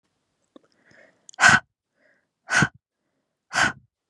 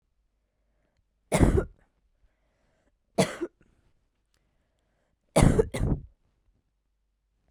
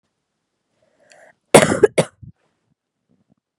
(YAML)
exhalation_length: 4.1 s
exhalation_amplitude: 29443
exhalation_signal_mean_std_ratio: 0.27
three_cough_length: 7.5 s
three_cough_amplitude: 18374
three_cough_signal_mean_std_ratio: 0.27
cough_length: 3.6 s
cough_amplitude: 32768
cough_signal_mean_std_ratio: 0.21
survey_phase: beta (2021-08-13 to 2022-03-07)
age: 18-44
gender: Female
wearing_mask: 'No'
symptom_cough_any: true
symptom_runny_or_blocked_nose: true
symptom_shortness_of_breath: true
symptom_fatigue: true
symptom_headache: true
symptom_onset: 13 days
smoker_status: Current smoker (1 to 10 cigarettes per day)
respiratory_condition_asthma: false
respiratory_condition_other: false
recruitment_source: REACT
submission_delay: 4 days
covid_test_result: Negative
covid_test_method: RT-qPCR